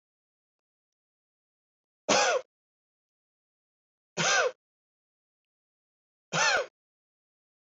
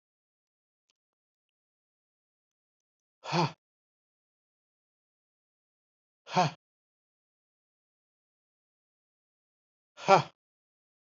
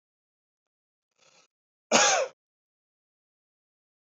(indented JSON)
{
  "three_cough_length": "7.8 s",
  "three_cough_amplitude": 9078,
  "three_cough_signal_mean_std_ratio": 0.28,
  "exhalation_length": "11.0 s",
  "exhalation_amplitude": 15503,
  "exhalation_signal_mean_std_ratio": 0.15,
  "cough_length": "4.0 s",
  "cough_amplitude": 18347,
  "cough_signal_mean_std_ratio": 0.23,
  "survey_phase": "beta (2021-08-13 to 2022-03-07)",
  "age": "45-64",
  "gender": "Male",
  "wearing_mask": "No",
  "symptom_none": true,
  "smoker_status": "Ex-smoker",
  "recruitment_source": "REACT",
  "submission_delay": "1 day",
  "covid_test_result": "Negative",
  "covid_test_method": "RT-qPCR",
  "influenza_a_test_result": "Negative",
  "influenza_b_test_result": "Negative"
}